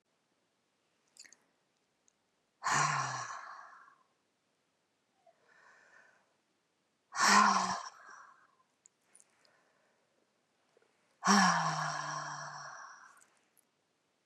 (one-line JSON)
{"exhalation_length": "14.3 s", "exhalation_amplitude": 7677, "exhalation_signal_mean_std_ratio": 0.32, "survey_phase": "beta (2021-08-13 to 2022-03-07)", "age": "45-64", "gender": "Female", "wearing_mask": "No", "symptom_none": true, "smoker_status": "Current smoker (11 or more cigarettes per day)", "respiratory_condition_asthma": false, "respiratory_condition_other": false, "recruitment_source": "REACT", "submission_delay": "4 days", "covid_test_result": "Negative", "covid_test_method": "RT-qPCR", "influenza_a_test_result": "Negative", "influenza_b_test_result": "Negative"}